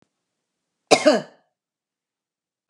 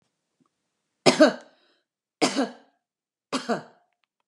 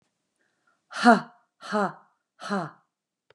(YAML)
cough_length: 2.7 s
cough_amplitude: 32767
cough_signal_mean_std_ratio: 0.22
three_cough_length: 4.3 s
three_cough_amplitude: 31479
three_cough_signal_mean_std_ratio: 0.27
exhalation_length: 3.3 s
exhalation_amplitude: 25541
exhalation_signal_mean_std_ratio: 0.27
survey_phase: beta (2021-08-13 to 2022-03-07)
age: 45-64
gender: Female
wearing_mask: 'No'
symptom_none: true
smoker_status: Never smoked
respiratory_condition_asthma: false
respiratory_condition_other: false
recruitment_source: REACT
submission_delay: 1 day
covid_test_result: Negative
covid_test_method: RT-qPCR